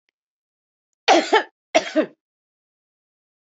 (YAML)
cough_length: 3.4 s
cough_amplitude: 28771
cough_signal_mean_std_ratio: 0.28
survey_phase: beta (2021-08-13 to 2022-03-07)
age: 45-64
gender: Female
wearing_mask: 'No'
symptom_none: true
smoker_status: Ex-smoker
respiratory_condition_asthma: false
respiratory_condition_other: true
recruitment_source: REACT
submission_delay: 1 day
covid_test_result: Negative
covid_test_method: RT-qPCR
influenza_a_test_result: Negative
influenza_b_test_result: Negative